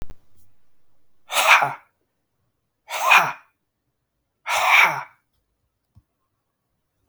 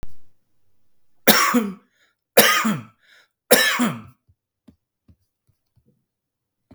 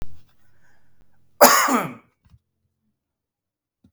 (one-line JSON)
{"exhalation_length": "7.1 s", "exhalation_amplitude": 32768, "exhalation_signal_mean_std_ratio": 0.34, "three_cough_length": "6.7 s", "three_cough_amplitude": 32768, "three_cough_signal_mean_std_ratio": 0.36, "cough_length": "3.9 s", "cough_amplitude": 32768, "cough_signal_mean_std_ratio": 0.29, "survey_phase": "beta (2021-08-13 to 2022-03-07)", "age": "45-64", "gender": "Male", "wearing_mask": "No", "symptom_none": true, "smoker_status": "Ex-smoker", "respiratory_condition_asthma": false, "respiratory_condition_other": false, "recruitment_source": "REACT", "submission_delay": "1 day", "covid_test_result": "Negative", "covid_test_method": "RT-qPCR", "influenza_a_test_result": "Negative", "influenza_b_test_result": "Negative"}